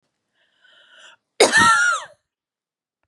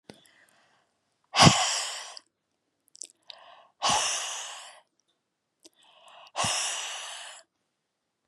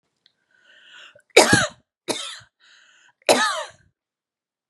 {"cough_length": "3.1 s", "cough_amplitude": 29326, "cough_signal_mean_std_ratio": 0.36, "exhalation_length": "8.3 s", "exhalation_amplitude": 25414, "exhalation_signal_mean_std_ratio": 0.33, "three_cough_length": "4.7 s", "three_cough_amplitude": 32767, "three_cough_signal_mean_std_ratio": 0.29, "survey_phase": "beta (2021-08-13 to 2022-03-07)", "age": "45-64", "gender": "Female", "wearing_mask": "No", "symptom_none": true, "symptom_onset": "3 days", "smoker_status": "Never smoked", "respiratory_condition_asthma": false, "respiratory_condition_other": false, "recruitment_source": "Test and Trace", "submission_delay": "2 days", "covid_test_result": "Negative", "covid_test_method": "RT-qPCR"}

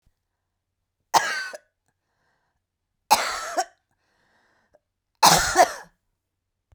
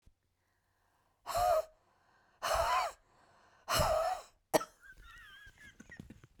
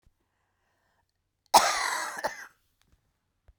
{"three_cough_length": "6.7 s", "three_cough_amplitude": 29983, "three_cough_signal_mean_std_ratio": 0.29, "exhalation_length": "6.4 s", "exhalation_amplitude": 6766, "exhalation_signal_mean_std_ratio": 0.42, "cough_length": "3.6 s", "cough_amplitude": 21758, "cough_signal_mean_std_ratio": 0.28, "survey_phase": "beta (2021-08-13 to 2022-03-07)", "age": "45-64", "gender": "Female", "wearing_mask": "No", "symptom_cough_any": true, "symptom_runny_or_blocked_nose": true, "symptom_shortness_of_breath": true, "symptom_other": true, "symptom_onset": "12 days", "smoker_status": "Never smoked", "respiratory_condition_asthma": false, "respiratory_condition_other": false, "recruitment_source": "REACT", "submission_delay": "1 day", "covid_test_result": "Negative", "covid_test_method": "RT-qPCR"}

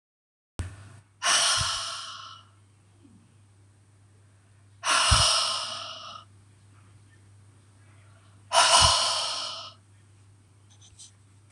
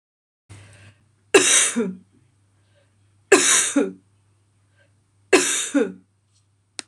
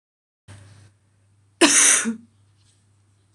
{"exhalation_length": "11.5 s", "exhalation_amplitude": 24273, "exhalation_signal_mean_std_ratio": 0.41, "three_cough_length": "6.9 s", "three_cough_amplitude": 26028, "three_cough_signal_mean_std_ratio": 0.37, "cough_length": "3.3 s", "cough_amplitude": 26028, "cough_signal_mean_std_ratio": 0.32, "survey_phase": "beta (2021-08-13 to 2022-03-07)", "age": "45-64", "gender": "Female", "wearing_mask": "No", "symptom_cough_any": true, "symptom_runny_or_blocked_nose": true, "symptom_change_to_sense_of_smell_or_taste": true, "symptom_loss_of_taste": true, "symptom_other": true, "symptom_onset": "4 days", "smoker_status": "Ex-smoker", "respiratory_condition_asthma": false, "respiratory_condition_other": false, "recruitment_source": "Test and Trace", "submission_delay": "4 days", "covid_test_result": "Positive", "covid_test_method": "RT-qPCR", "covid_ct_value": 19.1, "covid_ct_gene": "ORF1ab gene", "covid_ct_mean": 19.8, "covid_viral_load": "330000 copies/ml", "covid_viral_load_category": "Low viral load (10K-1M copies/ml)"}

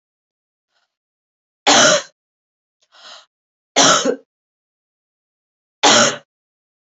{"three_cough_length": "6.9 s", "three_cough_amplitude": 32708, "three_cough_signal_mean_std_ratio": 0.31, "survey_phase": "beta (2021-08-13 to 2022-03-07)", "age": "18-44", "gender": "Female", "wearing_mask": "No", "symptom_cough_any": true, "symptom_runny_or_blocked_nose": true, "symptom_sore_throat": true, "symptom_fatigue": true, "symptom_change_to_sense_of_smell_or_taste": true, "symptom_onset": "4 days", "smoker_status": "Never smoked", "respiratory_condition_asthma": false, "respiratory_condition_other": false, "recruitment_source": "Test and Trace", "submission_delay": "2 days", "covid_test_result": "Positive", "covid_test_method": "RT-qPCR", "covid_ct_value": 22.2, "covid_ct_gene": "ORF1ab gene", "covid_ct_mean": 23.1, "covid_viral_load": "26000 copies/ml", "covid_viral_load_category": "Low viral load (10K-1M copies/ml)"}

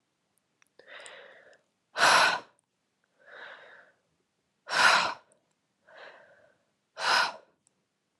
{"exhalation_length": "8.2 s", "exhalation_amplitude": 12399, "exhalation_signal_mean_std_ratio": 0.31, "survey_phase": "beta (2021-08-13 to 2022-03-07)", "age": "18-44", "gender": "Female", "wearing_mask": "Yes", "symptom_runny_or_blocked_nose": true, "symptom_sore_throat": true, "symptom_fatigue": true, "symptom_headache": true, "symptom_onset": "4 days", "smoker_status": "Never smoked", "respiratory_condition_asthma": false, "respiratory_condition_other": false, "recruitment_source": "Test and Trace", "submission_delay": "1 day", "covid_test_result": "Positive", "covid_test_method": "RT-qPCR", "covid_ct_value": 24.8, "covid_ct_gene": "N gene"}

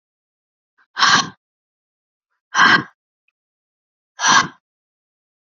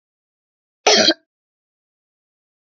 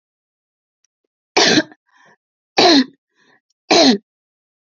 {"exhalation_length": "5.5 s", "exhalation_amplitude": 32677, "exhalation_signal_mean_std_ratio": 0.3, "cough_length": "2.6 s", "cough_amplitude": 29989, "cough_signal_mean_std_ratio": 0.25, "three_cough_length": "4.8 s", "three_cough_amplitude": 32767, "three_cough_signal_mean_std_ratio": 0.34, "survey_phase": "beta (2021-08-13 to 2022-03-07)", "age": "45-64", "gender": "Female", "wearing_mask": "No", "symptom_runny_or_blocked_nose": true, "symptom_abdominal_pain": true, "symptom_headache": true, "symptom_onset": "2 days", "smoker_status": "Never smoked", "respiratory_condition_asthma": false, "respiratory_condition_other": false, "recruitment_source": "Test and Trace", "submission_delay": "1 day", "covid_test_result": "Negative", "covid_test_method": "RT-qPCR"}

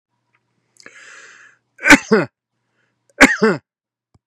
{"cough_length": "4.3 s", "cough_amplitude": 32768, "cough_signal_mean_std_ratio": 0.27, "survey_phase": "beta (2021-08-13 to 2022-03-07)", "age": "65+", "gender": "Male", "wearing_mask": "No", "symptom_none": true, "smoker_status": "Never smoked", "respiratory_condition_asthma": false, "respiratory_condition_other": false, "recruitment_source": "REACT", "submission_delay": "1 day", "covid_test_result": "Negative", "covid_test_method": "RT-qPCR", "influenza_a_test_result": "Negative", "influenza_b_test_result": "Negative"}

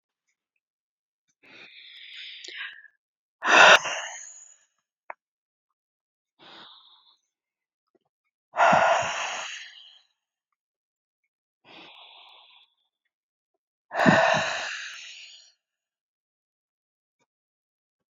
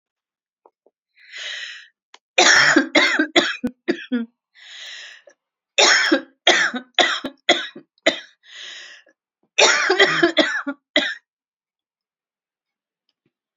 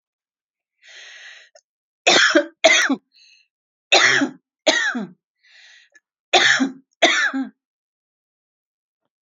{"exhalation_length": "18.1 s", "exhalation_amplitude": 25771, "exhalation_signal_mean_std_ratio": 0.26, "cough_length": "13.6 s", "cough_amplitude": 32768, "cough_signal_mean_std_ratio": 0.42, "three_cough_length": "9.2 s", "three_cough_amplitude": 32767, "three_cough_signal_mean_std_ratio": 0.39, "survey_phase": "alpha (2021-03-01 to 2021-08-12)", "age": "45-64", "gender": "Female", "wearing_mask": "No", "symptom_none": true, "smoker_status": "Never smoked", "respiratory_condition_asthma": false, "respiratory_condition_other": false, "recruitment_source": "REACT", "submission_delay": "1 day", "covid_test_result": "Negative", "covid_test_method": "RT-qPCR"}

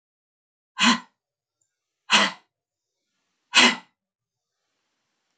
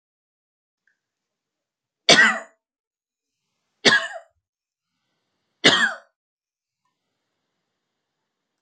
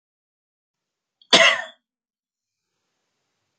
{"exhalation_length": "5.4 s", "exhalation_amplitude": 25343, "exhalation_signal_mean_std_ratio": 0.25, "three_cough_length": "8.6 s", "three_cough_amplitude": 32767, "three_cough_signal_mean_std_ratio": 0.22, "cough_length": "3.6 s", "cough_amplitude": 29607, "cough_signal_mean_std_ratio": 0.21, "survey_phase": "beta (2021-08-13 to 2022-03-07)", "age": "45-64", "gender": "Female", "wearing_mask": "No", "symptom_none": true, "smoker_status": "Never smoked", "respiratory_condition_asthma": false, "respiratory_condition_other": false, "recruitment_source": "REACT", "submission_delay": "3 days", "covid_test_result": "Negative", "covid_test_method": "RT-qPCR", "influenza_a_test_result": "Negative", "influenza_b_test_result": "Negative"}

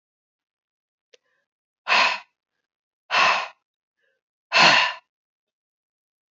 {"exhalation_length": "6.3 s", "exhalation_amplitude": 25155, "exhalation_signal_mean_std_ratio": 0.31, "survey_phase": "beta (2021-08-13 to 2022-03-07)", "age": "45-64", "gender": "Female", "wearing_mask": "No", "symptom_none": true, "smoker_status": "Never smoked", "respiratory_condition_asthma": false, "respiratory_condition_other": false, "recruitment_source": "REACT", "submission_delay": "1 day", "covid_test_result": "Negative", "covid_test_method": "RT-qPCR", "influenza_a_test_result": "Negative", "influenza_b_test_result": "Negative"}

